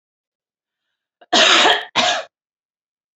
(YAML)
cough_length: 3.2 s
cough_amplitude: 30614
cough_signal_mean_std_ratio: 0.39
survey_phase: beta (2021-08-13 to 2022-03-07)
age: 18-44
gender: Female
wearing_mask: 'No'
symptom_none: true
smoker_status: Never smoked
respiratory_condition_asthma: false
respiratory_condition_other: false
recruitment_source: REACT
submission_delay: 4 days
covid_test_result: Negative
covid_test_method: RT-qPCR
influenza_a_test_result: Negative
influenza_b_test_result: Negative